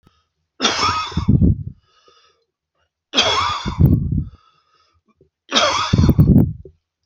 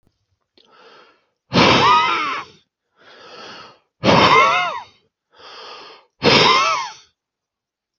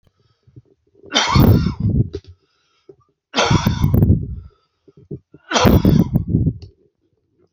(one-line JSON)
{"cough_length": "7.1 s", "cough_amplitude": 29547, "cough_signal_mean_std_ratio": 0.5, "exhalation_length": "8.0 s", "exhalation_amplitude": 29213, "exhalation_signal_mean_std_ratio": 0.45, "three_cough_length": "7.5 s", "three_cough_amplitude": 32268, "three_cough_signal_mean_std_ratio": 0.49, "survey_phase": "alpha (2021-03-01 to 2021-08-12)", "age": "45-64", "gender": "Male", "wearing_mask": "No", "symptom_none": true, "smoker_status": "Ex-smoker", "respiratory_condition_asthma": false, "respiratory_condition_other": false, "recruitment_source": "REACT", "submission_delay": "1 day", "covid_test_result": "Negative", "covid_test_method": "RT-qPCR"}